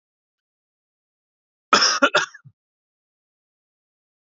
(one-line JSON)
{"cough_length": "4.4 s", "cough_amplitude": 28257, "cough_signal_mean_std_ratio": 0.23, "survey_phase": "beta (2021-08-13 to 2022-03-07)", "age": "18-44", "gender": "Male", "wearing_mask": "No", "symptom_fatigue": true, "symptom_onset": "13 days", "smoker_status": "Ex-smoker", "respiratory_condition_asthma": false, "respiratory_condition_other": false, "recruitment_source": "REACT", "submission_delay": "1 day", "covid_test_result": "Positive", "covid_test_method": "RT-qPCR", "covid_ct_value": 36.9, "covid_ct_gene": "E gene", "influenza_a_test_result": "Negative", "influenza_b_test_result": "Negative"}